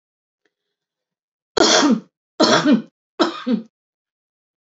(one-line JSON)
{"three_cough_length": "4.6 s", "three_cough_amplitude": 29327, "three_cough_signal_mean_std_ratio": 0.4, "survey_phase": "alpha (2021-03-01 to 2021-08-12)", "age": "45-64", "gender": "Female", "wearing_mask": "No", "symptom_none": true, "smoker_status": "Ex-smoker", "respiratory_condition_asthma": false, "respiratory_condition_other": false, "recruitment_source": "REACT", "submission_delay": "4 days", "covid_test_result": "Negative", "covid_test_method": "RT-qPCR"}